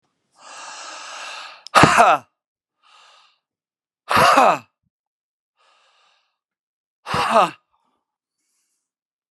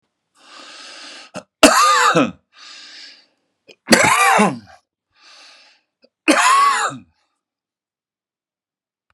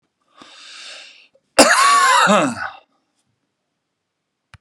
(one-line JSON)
{"exhalation_length": "9.3 s", "exhalation_amplitude": 32768, "exhalation_signal_mean_std_ratio": 0.3, "three_cough_length": "9.1 s", "three_cough_amplitude": 32768, "three_cough_signal_mean_std_ratio": 0.4, "cough_length": "4.6 s", "cough_amplitude": 32768, "cough_signal_mean_std_ratio": 0.4, "survey_phase": "beta (2021-08-13 to 2022-03-07)", "age": "45-64", "gender": "Male", "wearing_mask": "No", "symptom_none": true, "smoker_status": "Ex-smoker", "respiratory_condition_asthma": false, "respiratory_condition_other": false, "recruitment_source": "REACT", "submission_delay": "5 days", "covid_test_result": "Negative", "covid_test_method": "RT-qPCR", "influenza_a_test_result": "Negative", "influenza_b_test_result": "Negative"}